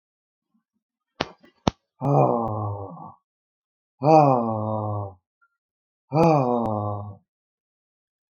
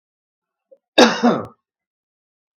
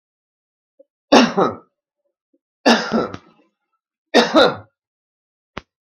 {
  "exhalation_length": "8.4 s",
  "exhalation_amplitude": 32768,
  "exhalation_signal_mean_std_ratio": 0.4,
  "cough_length": "2.6 s",
  "cough_amplitude": 32768,
  "cough_signal_mean_std_ratio": 0.28,
  "three_cough_length": "6.0 s",
  "three_cough_amplitude": 32768,
  "three_cough_signal_mean_std_ratio": 0.32,
  "survey_phase": "beta (2021-08-13 to 2022-03-07)",
  "age": "65+",
  "gender": "Male",
  "wearing_mask": "No",
  "symptom_none": true,
  "smoker_status": "Never smoked",
  "respiratory_condition_asthma": false,
  "respiratory_condition_other": false,
  "recruitment_source": "REACT",
  "submission_delay": "0 days",
  "covid_test_result": "Negative",
  "covid_test_method": "RT-qPCR"
}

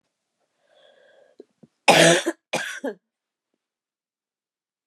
{
  "cough_length": "4.9 s",
  "cough_amplitude": 27766,
  "cough_signal_mean_std_ratio": 0.26,
  "survey_phase": "beta (2021-08-13 to 2022-03-07)",
  "age": "45-64",
  "gender": "Female",
  "wearing_mask": "No",
  "symptom_cough_any": true,
  "symptom_new_continuous_cough": true,
  "symptom_runny_or_blocked_nose": true,
  "symptom_sore_throat": true,
  "symptom_fatigue": true,
  "symptom_headache": true,
  "symptom_onset": "7 days",
  "smoker_status": "Ex-smoker",
  "respiratory_condition_asthma": false,
  "respiratory_condition_other": false,
  "recruitment_source": "Test and Trace",
  "submission_delay": "2 days",
  "covid_test_result": "Positive",
  "covid_test_method": "ePCR"
}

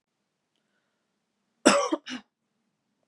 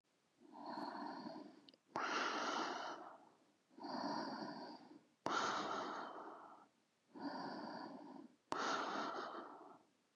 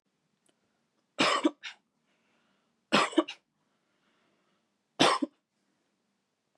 {
  "cough_length": "3.1 s",
  "cough_amplitude": 28729,
  "cough_signal_mean_std_ratio": 0.24,
  "exhalation_length": "10.2 s",
  "exhalation_amplitude": 2027,
  "exhalation_signal_mean_std_ratio": 0.71,
  "three_cough_length": "6.6 s",
  "three_cough_amplitude": 12403,
  "three_cough_signal_mean_std_ratio": 0.26,
  "survey_phase": "beta (2021-08-13 to 2022-03-07)",
  "age": "18-44",
  "gender": "Female",
  "wearing_mask": "No",
  "symptom_sore_throat": true,
  "symptom_fatigue": true,
  "symptom_headache": true,
  "symptom_other": true,
  "smoker_status": "Never smoked",
  "respiratory_condition_asthma": false,
  "respiratory_condition_other": false,
  "recruitment_source": "Test and Trace",
  "submission_delay": "1 day",
  "covid_test_result": "Positive",
  "covid_test_method": "LFT"
}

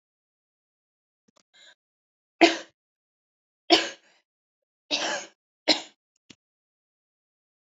{
  "three_cough_length": "7.7 s",
  "three_cough_amplitude": 25885,
  "three_cough_signal_mean_std_ratio": 0.2,
  "survey_phase": "alpha (2021-03-01 to 2021-08-12)",
  "age": "18-44",
  "gender": "Female",
  "wearing_mask": "No",
  "symptom_none": true,
  "smoker_status": "Never smoked",
  "respiratory_condition_asthma": true,
  "respiratory_condition_other": false,
  "recruitment_source": "REACT",
  "submission_delay": "2 days",
  "covid_test_result": "Negative",
  "covid_test_method": "RT-qPCR"
}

